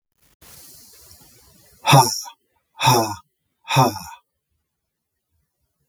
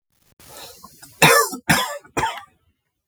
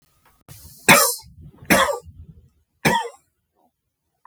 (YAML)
exhalation_length: 5.9 s
exhalation_amplitude: 32768
exhalation_signal_mean_std_ratio: 0.3
cough_length: 3.1 s
cough_amplitude: 32768
cough_signal_mean_std_ratio: 0.38
three_cough_length: 4.3 s
three_cough_amplitude: 32767
three_cough_signal_mean_std_ratio: 0.33
survey_phase: beta (2021-08-13 to 2022-03-07)
age: 45-64
gender: Male
wearing_mask: 'No'
symptom_none: true
smoker_status: Never smoked
respiratory_condition_asthma: true
respiratory_condition_other: true
recruitment_source: Test and Trace
submission_delay: 0 days
covid_test_result: Negative
covid_test_method: RT-qPCR